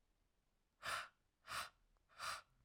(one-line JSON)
{"exhalation_length": "2.6 s", "exhalation_amplitude": 830, "exhalation_signal_mean_std_ratio": 0.43, "survey_phase": "alpha (2021-03-01 to 2021-08-12)", "age": "18-44", "gender": "Female", "wearing_mask": "No", "symptom_cough_any": true, "symptom_new_continuous_cough": true, "symptom_fatigue": true, "symptom_fever_high_temperature": true, "symptom_headache": true, "symptom_change_to_sense_of_smell_or_taste": true, "symptom_onset": "2 days", "smoker_status": "Ex-smoker", "respiratory_condition_asthma": false, "respiratory_condition_other": false, "recruitment_source": "Test and Trace", "submission_delay": "1 day", "covid_test_result": "Positive", "covid_test_method": "RT-qPCR"}